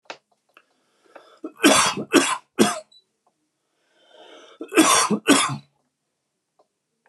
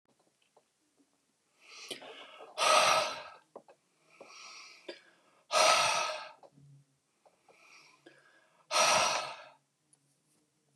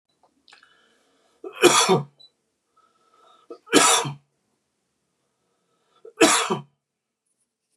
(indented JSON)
{
  "cough_length": "7.1 s",
  "cough_amplitude": 29501,
  "cough_signal_mean_std_ratio": 0.36,
  "exhalation_length": "10.8 s",
  "exhalation_amplitude": 9674,
  "exhalation_signal_mean_std_ratio": 0.36,
  "three_cough_length": "7.8 s",
  "three_cough_amplitude": 28812,
  "three_cough_signal_mean_std_ratio": 0.3,
  "survey_phase": "beta (2021-08-13 to 2022-03-07)",
  "age": "45-64",
  "gender": "Male",
  "wearing_mask": "No",
  "symptom_none": true,
  "smoker_status": "Never smoked",
  "respiratory_condition_asthma": false,
  "respiratory_condition_other": false,
  "recruitment_source": "REACT",
  "submission_delay": "3 days",
  "covid_test_result": "Negative",
  "covid_test_method": "RT-qPCR",
  "influenza_a_test_result": "Negative",
  "influenza_b_test_result": "Negative"
}